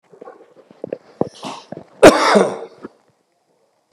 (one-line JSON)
{"cough_length": "3.9 s", "cough_amplitude": 32768, "cough_signal_mean_std_ratio": 0.3, "survey_phase": "beta (2021-08-13 to 2022-03-07)", "age": "65+", "gender": "Male", "wearing_mask": "No", "symptom_none": true, "smoker_status": "Never smoked", "respiratory_condition_asthma": false, "respiratory_condition_other": false, "recruitment_source": "REACT", "submission_delay": "3 days", "covid_test_result": "Negative", "covid_test_method": "RT-qPCR", "influenza_a_test_result": "Unknown/Void", "influenza_b_test_result": "Unknown/Void"}